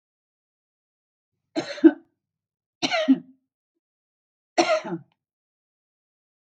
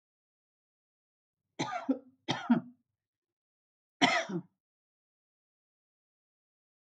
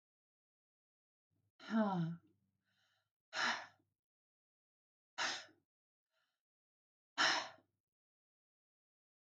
{
  "three_cough_length": "6.6 s",
  "three_cough_amplitude": 25127,
  "three_cough_signal_mean_std_ratio": 0.24,
  "cough_length": "7.0 s",
  "cough_amplitude": 9795,
  "cough_signal_mean_std_ratio": 0.25,
  "exhalation_length": "9.3 s",
  "exhalation_amplitude": 2845,
  "exhalation_signal_mean_std_ratio": 0.29,
  "survey_phase": "beta (2021-08-13 to 2022-03-07)",
  "age": "65+",
  "gender": "Female",
  "wearing_mask": "No",
  "symptom_none": true,
  "smoker_status": "Never smoked",
  "respiratory_condition_asthma": false,
  "respiratory_condition_other": false,
  "recruitment_source": "REACT",
  "submission_delay": "1 day",
  "covid_test_result": "Negative",
  "covid_test_method": "RT-qPCR"
}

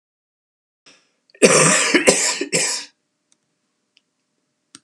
{
  "cough_length": "4.8 s",
  "cough_amplitude": 32768,
  "cough_signal_mean_std_ratio": 0.38,
  "survey_phase": "alpha (2021-03-01 to 2021-08-12)",
  "age": "65+",
  "gender": "Male",
  "wearing_mask": "No",
  "symptom_fatigue": true,
  "symptom_onset": "12 days",
  "smoker_status": "Ex-smoker",
  "respiratory_condition_asthma": true,
  "respiratory_condition_other": false,
  "recruitment_source": "REACT",
  "submission_delay": "2 days",
  "covid_test_result": "Negative",
  "covid_test_method": "RT-qPCR"
}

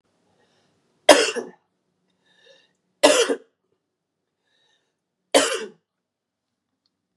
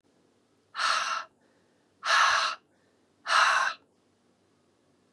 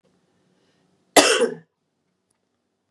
{
  "three_cough_length": "7.2 s",
  "three_cough_amplitude": 32768,
  "three_cough_signal_mean_std_ratio": 0.24,
  "exhalation_length": "5.1 s",
  "exhalation_amplitude": 10002,
  "exhalation_signal_mean_std_ratio": 0.43,
  "cough_length": "2.9 s",
  "cough_amplitude": 32715,
  "cough_signal_mean_std_ratio": 0.25,
  "survey_phase": "beta (2021-08-13 to 2022-03-07)",
  "age": "18-44",
  "gender": "Female",
  "wearing_mask": "No",
  "symptom_cough_any": true,
  "symptom_runny_or_blocked_nose": true,
  "symptom_fatigue": true,
  "symptom_headache": true,
  "symptom_other": true,
  "symptom_onset": "3 days",
  "smoker_status": "Ex-smoker",
  "respiratory_condition_asthma": false,
  "respiratory_condition_other": false,
  "recruitment_source": "Test and Trace",
  "submission_delay": "1 day",
  "covid_test_result": "Positive",
  "covid_test_method": "RT-qPCR"
}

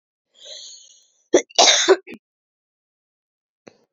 {
  "cough_length": "3.9 s",
  "cough_amplitude": 32767,
  "cough_signal_mean_std_ratio": 0.27,
  "survey_phase": "beta (2021-08-13 to 2022-03-07)",
  "age": "18-44",
  "gender": "Female",
  "wearing_mask": "No",
  "symptom_runny_or_blocked_nose": true,
  "symptom_diarrhoea": true,
  "symptom_fatigue": true,
  "symptom_fever_high_temperature": true,
  "symptom_headache": true,
  "symptom_onset": "2 days",
  "smoker_status": "Current smoker (e-cigarettes or vapes only)",
  "respiratory_condition_asthma": false,
  "respiratory_condition_other": false,
  "recruitment_source": "Test and Trace",
  "submission_delay": "1 day",
  "covid_test_result": "Positive",
  "covid_test_method": "RT-qPCR",
  "covid_ct_value": 13.5,
  "covid_ct_gene": "ORF1ab gene",
  "covid_ct_mean": 14.2,
  "covid_viral_load": "23000000 copies/ml",
  "covid_viral_load_category": "High viral load (>1M copies/ml)"
}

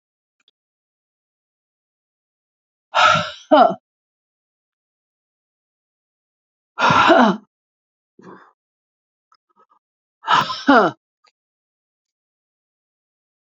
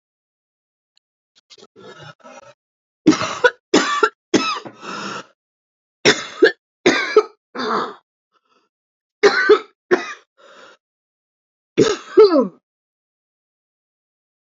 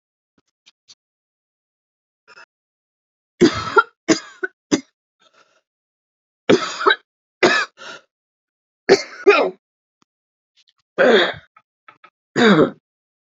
{
  "exhalation_length": "13.6 s",
  "exhalation_amplitude": 31530,
  "exhalation_signal_mean_std_ratio": 0.27,
  "cough_length": "14.4 s",
  "cough_amplitude": 32767,
  "cough_signal_mean_std_ratio": 0.33,
  "three_cough_length": "13.4 s",
  "three_cough_amplitude": 32063,
  "three_cough_signal_mean_std_ratio": 0.3,
  "survey_phase": "beta (2021-08-13 to 2022-03-07)",
  "age": "45-64",
  "gender": "Female",
  "wearing_mask": "No",
  "symptom_cough_any": true,
  "symptom_new_continuous_cough": true,
  "symptom_runny_or_blocked_nose": true,
  "symptom_shortness_of_breath": true,
  "symptom_fever_high_temperature": true,
  "symptom_headache": true,
  "symptom_change_to_sense_of_smell_or_taste": true,
  "symptom_other": true,
  "smoker_status": "Never smoked",
  "respiratory_condition_asthma": true,
  "respiratory_condition_other": false,
  "recruitment_source": "Test and Trace",
  "submission_delay": "2 days",
  "covid_test_result": "Positive",
  "covid_test_method": "LFT"
}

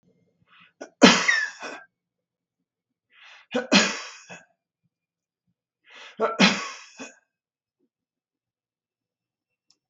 {
  "three_cough_length": "9.9 s",
  "three_cough_amplitude": 32768,
  "three_cough_signal_mean_std_ratio": 0.26,
  "survey_phase": "beta (2021-08-13 to 2022-03-07)",
  "age": "65+",
  "gender": "Male",
  "wearing_mask": "No",
  "symptom_none": true,
  "smoker_status": "Never smoked",
  "respiratory_condition_asthma": false,
  "respiratory_condition_other": false,
  "recruitment_source": "REACT",
  "submission_delay": "3 days",
  "covid_test_result": "Negative",
  "covid_test_method": "RT-qPCR",
  "influenza_a_test_result": "Negative",
  "influenza_b_test_result": "Negative"
}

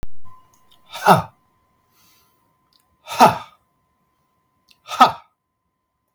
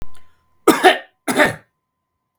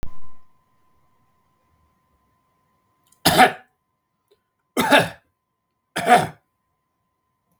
{
  "exhalation_length": "6.1 s",
  "exhalation_amplitude": 32768,
  "exhalation_signal_mean_std_ratio": 0.27,
  "cough_length": "2.4 s",
  "cough_amplitude": 32768,
  "cough_signal_mean_std_ratio": 0.4,
  "three_cough_length": "7.6 s",
  "three_cough_amplitude": 32766,
  "three_cough_signal_mean_std_ratio": 0.3,
  "survey_phase": "beta (2021-08-13 to 2022-03-07)",
  "age": "45-64",
  "gender": "Male",
  "wearing_mask": "No",
  "symptom_runny_or_blocked_nose": true,
  "smoker_status": "Never smoked",
  "respiratory_condition_asthma": false,
  "respiratory_condition_other": false,
  "recruitment_source": "REACT",
  "submission_delay": "1 day",
  "covid_test_result": "Negative",
  "covid_test_method": "RT-qPCR",
  "influenza_a_test_result": "Negative",
  "influenza_b_test_result": "Negative"
}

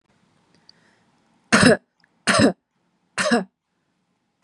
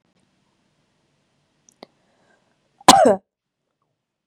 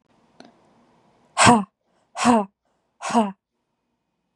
{
  "three_cough_length": "4.4 s",
  "three_cough_amplitude": 30556,
  "three_cough_signal_mean_std_ratio": 0.32,
  "cough_length": "4.3 s",
  "cough_amplitude": 32768,
  "cough_signal_mean_std_ratio": 0.2,
  "exhalation_length": "4.4 s",
  "exhalation_amplitude": 32655,
  "exhalation_signal_mean_std_ratio": 0.31,
  "survey_phase": "beta (2021-08-13 to 2022-03-07)",
  "age": "18-44",
  "gender": "Female",
  "wearing_mask": "No",
  "symptom_none": true,
  "smoker_status": "Never smoked",
  "respiratory_condition_asthma": false,
  "respiratory_condition_other": false,
  "recruitment_source": "REACT",
  "submission_delay": "0 days",
  "covid_test_result": "Negative",
  "covid_test_method": "RT-qPCR",
  "influenza_a_test_result": "Negative",
  "influenza_b_test_result": "Negative"
}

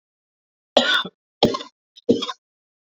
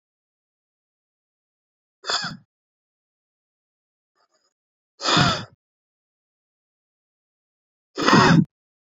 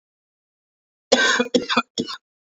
{
  "three_cough_length": "3.0 s",
  "three_cough_amplitude": 28232,
  "three_cough_signal_mean_std_ratio": 0.33,
  "exhalation_length": "9.0 s",
  "exhalation_amplitude": 26662,
  "exhalation_signal_mean_std_ratio": 0.25,
  "cough_length": "2.6 s",
  "cough_amplitude": 26822,
  "cough_signal_mean_std_ratio": 0.39,
  "survey_phase": "beta (2021-08-13 to 2022-03-07)",
  "age": "18-44",
  "gender": "Male",
  "wearing_mask": "No",
  "symptom_cough_any": true,
  "symptom_runny_or_blocked_nose": true,
  "symptom_shortness_of_breath": true,
  "symptom_sore_throat": true,
  "symptom_diarrhoea": true,
  "symptom_fatigue": true,
  "symptom_fever_high_temperature": true,
  "symptom_headache": true,
  "symptom_change_to_sense_of_smell_or_taste": true,
  "symptom_loss_of_taste": true,
  "smoker_status": "Ex-smoker",
  "respiratory_condition_asthma": false,
  "respiratory_condition_other": false,
  "recruitment_source": "Test and Trace",
  "submission_delay": "2 days",
  "covid_test_result": "Positive",
  "covid_test_method": "ePCR"
}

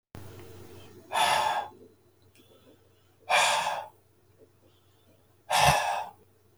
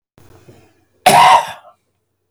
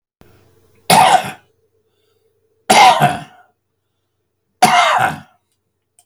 {
  "exhalation_length": "6.6 s",
  "exhalation_amplitude": 14702,
  "exhalation_signal_mean_std_ratio": 0.44,
  "cough_length": "2.3 s",
  "cough_amplitude": 32768,
  "cough_signal_mean_std_ratio": 0.36,
  "three_cough_length": "6.1 s",
  "three_cough_amplitude": 32768,
  "three_cough_signal_mean_std_ratio": 0.38,
  "survey_phase": "beta (2021-08-13 to 2022-03-07)",
  "age": "65+",
  "gender": "Male",
  "wearing_mask": "No",
  "symptom_cough_any": true,
  "symptom_onset": "12 days",
  "smoker_status": "Ex-smoker",
  "respiratory_condition_asthma": false,
  "respiratory_condition_other": false,
  "recruitment_source": "REACT",
  "submission_delay": "2 days",
  "covid_test_result": "Negative",
  "covid_test_method": "RT-qPCR",
  "influenza_a_test_result": "Negative",
  "influenza_b_test_result": "Negative"
}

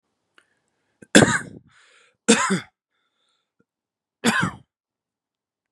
{
  "three_cough_length": "5.7 s",
  "three_cough_amplitude": 32767,
  "three_cough_signal_mean_std_ratio": 0.26,
  "survey_phase": "beta (2021-08-13 to 2022-03-07)",
  "age": "18-44",
  "gender": "Male",
  "wearing_mask": "No",
  "symptom_cough_any": true,
  "symptom_shortness_of_breath": true,
  "symptom_sore_throat": true,
  "symptom_fatigue": true,
  "symptom_onset": "2 days",
  "smoker_status": "Ex-smoker",
  "respiratory_condition_asthma": true,
  "respiratory_condition_other": false,
  "recruitment_source": "Test and Trace",
  "submission_delay": "2 days",
  "covid_test_result": "Positive",
  "covid_test_method": "RT-qPCR",
  "covid_ct_value": 19.3,
  "covid_ct_gene": "ORF1ab gene",
  "covid_ct_mean": 19.7,
  "covid_viral_load": "340000 copies/ml",
  "covid_viral_load_category": "Low viral load (10K-1M copies/ml)"
}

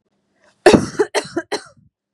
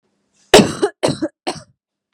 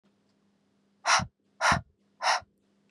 {
  "cough_length": "2.1 s",
  "cough_amplitude": 32768,
  "cough_signal_mean_std_ratio": 0.33,
  "three_cough_length": "2.1 s",
  "three_cough_amplitude": 32768,
  "three_cough_signal_mean_std_ratio": 0.33,
  "exhalation_length": "2.9 s",
  "exhalation_amplitude": 11472,
  "exhalation_signal_mean_std_ratio": 0.35,
  "survey_phase": "beta (2021-08-13 to 2022-03-07)",
  "age": "18-44",
  "gender": "Female",
  "wearing_mask": "No",
  "symptom_none": true,
  "smoker_status": "Never smoked",
  "respiratory_condition_asthma": false,
  "respiratory_condition_other": false,
  "recruitment_source": "REACT",
  "submission_delay": "2 days",
  "covid_test_result": "Negative",
  "covid_test_method": "RT-qPCR",
  "influenza_a_test_result": "Negative",
  "influenza_b_test_result": "Negative"
}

